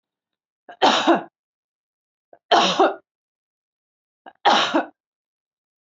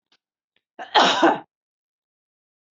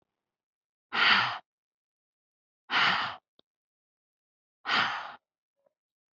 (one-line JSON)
{"three_cough_length": "5.8 s", "three_cough_amplitude": 22877, "three_cough_signal_mean_std_ratio": 0.35, "cough_length": "2.7 s", "cough_amplitude": 25657, "cough_signal_mean_std_ratio": 0.31, "exhalation_length": "6.1 s", "exhalation_amplitude": 11063, "exhalation_signal_mean_std_ratio": 0.34, "survey_phase": "beta (2021-08-13 to 2022-03-07)", "age": "18-44", "gender": "Female", "wearing_mask": "No", "symptom_none": true, "smoker_status": "Never smoked", "respiratory_condition_asthma": false, "respiratory_condition_other": false, "recruitment_source": "REACT", "submission_delay": "1 day", "covid_test_result": "Negative", "covid_test_method": "RT-qPCR", "influenza_a_test_result": "Unknown/Void", "influenza_b_test_result": "Unknown/Void"}